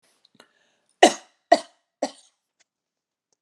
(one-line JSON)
{"three_cough_length": "3.4 s", "three_cough_amplitude": 32028, "three_cough_signal_mean_std_ratio": 0.16, "survey_phase": "alpha (2021-03-01 to 2021-08-12)", "age": "45-64", "gender": "Female", "wearing_mask": "No", "symptom_none": true, "smoker_status": "Never smoked", "respiratory_condition_asthma": false, "respiratory_condition_other": false, "recruitment_source": "REACT", "submission_delay": "1 day", "covid_test_result": "Negative", "covid_test_method": "RT-qPCR"}